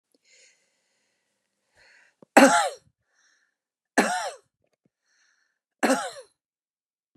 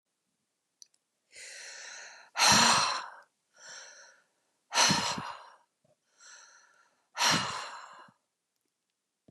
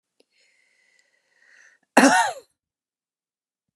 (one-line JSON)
{"three_cough_length": "7.2 s", "three_cough_amplitude": 30241, "three_cough_signal_mean_std_ratio": 0.24, "exhalation_length": "9.3 s", "exhalation_amplitude": 12290, "exhalation_signal_mean_std_ratio": 0.35, "cough_length": "3.8 s", "cough_amplitude": 31365, "cough_signal_mean_std_ratio": 0.23, "survey_phase": "beta (2021-08-13 to 2022-03-07)", "age": "65+", "gender": "Female", "wearing_mask": "No", "symptom_none": true, "smoker_status": "Never smoked", "respiratory_condition_asthma": true, "respiratory_condition_other": false, "recruitment_source": "REACT", "submission_delay": "1 day", "covid_test_result": "Negative", "covid_test_method": "RT-qPCR"}